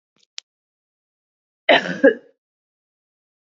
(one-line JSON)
{"cough_length": "3.5 s", "cough_amplitude": 30511, "cough_signal_mean_std_ratio": 0.22, "survey_phase": "beta (2021-08-13 to 2022-03-07)", "age": "45-64", "gender": "Female", "wearing_mask": "No", "symptom_sore_throat": true, "symptom_abdominal_pain": true, "symptom_fatigue": true, "symptom_headache": true, "symptom_onset": "5 days", "smoker_status": "Ex-smoker", "respiratory_condition_asthma": true, "respiratory_condition_other": false, "recruitment_source": "Test and Trace", "submission_delay": "1 day", "covid_test_result": "Negative", "covid_test_method": "RT-qPCR"}